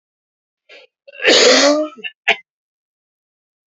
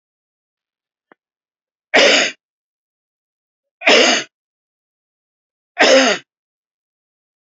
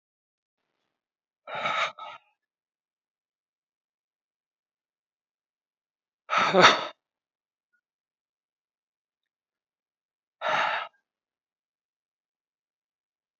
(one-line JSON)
{"cough_length": "3.7 s", "cough_amplitude": 32768, "cough_signal_mean_std_ratio": 0.38, "three_cough_length": "7.4 s", "three_cough_amplitude": 32191, "three_cough_signal_mean_std_ratio": 0.31, "exhalation_length": "13.4 s", "exhalation_amplitude": 25296, "exhalation_signal_mean_std_ratio": 0.21, "survey_phase": "beta (2021-08-13 to 2022-03-07)", "age": "45-64", "gender": "Male", "wearing_mask": "No", "symptom_cough_any": true, "symptom_runny_or_blocked_nose": true, "symptom_sore_throat": true, "symptom_fatigue": true, "symptom_headache": true, "symptom_onset": "5 days", "smoker_status": "Never smoked", "respiratory_condition_asthma": false, "respiratory_condition_other": false, "recruitment_source": "Test and Trace", "submission_delay": "1 day", "covid_test_result": "Positive", "covid_test_method": "RT-qPCR", "covid_ct_value": 25.6, "covid_ct_gene": "N gene"}